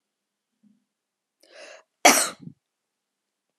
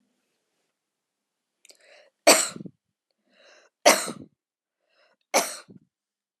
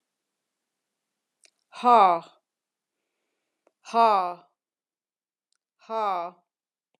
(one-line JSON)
{"cough_length": "3.6 s", "cough_amplitude": 32461, "cough_signal_mean_std_ratio": 0.19, "three_cough_length": "6.4 s", "three_cough_amplitude": 25729, "three_cough_signal_mean_std_ratio": 0.21, "exhalation_length": "7.0 s", "exhalation_amplitude": 18872, "exhalation_signal_mean_std_ratio": 0.26, "survey_phase": "alpha (2021-03-01 to 2021-08-12)", "age": "65+", "gender": "Female", "wearing_mask": "No", "symptom_none": true, "smoker_status": "Never smoked", "respiratory_condition_asthma": false, "respiratory_condition_other": false, "recruitment_source": "REACT", "submission_delay": "3 days", "covid_test_result": "Negative", "covid_test_method": "RT-qPCR"}